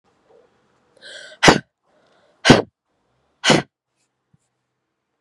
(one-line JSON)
{"exhalation_length": "5.2 s", "exhalation_amplitude": 32768, "exhalation_signal_mean_std_ratio": 0.23, "survey_phase": "beta (2021-08-13 to 2022-03-07)", "age": "18-44", "gender": "Female", "wearing_mask": "No", "symptom_cough_any": true, "symptom_abdominal_pain": true, "symptom_fatigue": true, "symptom_fever_high_temperature": true, "symptom_headache": true, "symptom_other": true, "smoker_status": "Never smoked", "respiratory_condition_asthma": false, "respiratory_condition_other": false, "recruitment_source": "Test and Trace", "submission_delay": "1 day", "covid_test_result": "Positive", "covid_test_method": "RT-qPCR"}